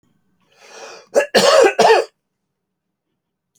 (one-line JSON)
{"cough_length": "3.6 s", "cough_amplitude": 30121, "cough_signal_mean_std_ratio": 0.39, "survey_phase": "alpha (2021-03-01 to 2021-08-12)", "age": "45-64", "gender": "Male", "wearing_mask": "No", "symptom_none": true, "smoker_status": "Never smoked", "respiratory_condition_asthma": false, "respiratory_condition_other": false, "recruitment_source": "REACT", "submission_delay": "1 day", "covid_test_result": "Negative", "covid_test_method": "RT-qPCR"}